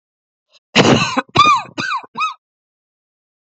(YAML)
cough_length: 3.6 s
cough_amplitude: 31301
cough_signal_mean_std_ratio: 0.42
survey_phase: beta (2021-08-13 to 2022-03-07)
age: 45-64
gender: Female
wearing_mask: 'No'
symptom_cough_any: true
symptom_runny_or_blocked_nose: true
symptom_sore_throat: true
symptom_diarrhoea: true
symptom_fever_high_temperature: true
symptom_other: true
symptom_onset: 3 days
smoker_status: Never smoked
respiratory_condition_asthma: false
respiratory_condition_other: false
recruitment_source: Test and Trace
submission_delay: 1 day
covid_test_result: Positive
covid_test_method: RT-qPCR
covid_ct_value: 20.3
covid_ct_gene: ORF1ab gene
covid_ct_mean: 20.6
covid_viral_load: 180000 copies/ml
covid_viral_load_category: Low viral load (10K-1M copies/ml)